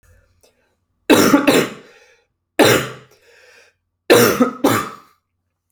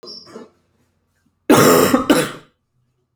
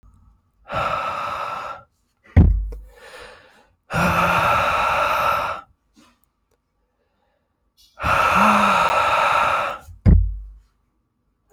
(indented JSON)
{
  "three_cough_length": "5.7 s",
  "three_cough_amplitude": 32768,
  "three_cough_signal_mean_std_ratio": 0.41,
  "cough_length": "3.2 s",
  "cough_amplitude": 31469,
  "cough_signal_mean_std_ratio": 0.41,
  "exhalation_length": "11.5 s",
  "exhalation_amplitude": 27176,
  "exhalation_signal_mean_std_ratio": 0.56,
  "survey_phase": "alpha (2021-03-01 to 2021-08-12)",
  "age": "18-44",
  "gender": "Male",
  "wearing_mask": "No",
  "symptom_cough_any": true,
  "symptom_fever_high_temperature": true,
  "symptom_headache": true,
  "smoker_status": "Never smoked",
  "respiratory_condition_asthma": false,
  "respiratory_condition_other": false,
  "recruitment_source": "Test and Trace",
  "submission_delay": "2 days",
  "covid_test_result": "Positive",
  "covid_test_method": "ePCR"
}